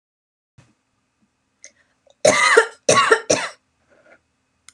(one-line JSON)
{"cough_length": "4.7 s", "cough_amplitude": 32767, "cough_signal_mean_std_ratio": 0.33, "survey_phase": "beta (2021-08-13 to 2022-03-07)", "age": "45-64", "gender": "Female", "wearing_mask": "No", "symptom_sore_throat": true, "symptom_fatigue": true, "symptom_headache": true, "symptom_onset": "13 days", "smoker_status": "Never smoked", "respiratory_condition_asthma": false, "respiratory_condition_other": false, "recruitment_source": "REACT", "submission_delay": "1 day", "covid_test_result": "Negative", "covid_test_method": "RT-qPCR"}